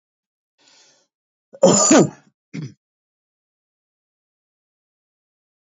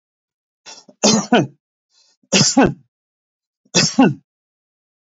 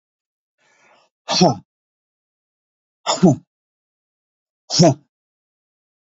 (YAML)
cough_length: 5.6 s
cough_amplitude: 27925
cough_signal_mean_std_ratio: 0.23
three_cough_length: 5.0 s
three_cough_amplitude: 32254
three_cough_signal_mean_std_ratio: 0.36
exhalation_length: 6.1 s
exhalation_amplitude: 30140
exhalation_signal_mean_std_ratio: 0.26
survey_phase: alpha (2021-03-01 to 2021-08-12)
age: 65+
gender: Male
wearing_mask: 'No'
symptom_none: true
smoker_status: Never smoked
respiratory_condition_asthma: false
respiratory_condition_other: false
recruitment_source: REACT
submission_delay: 2 days
covid_test_result: Negative
covid_test_method: RT-qPCR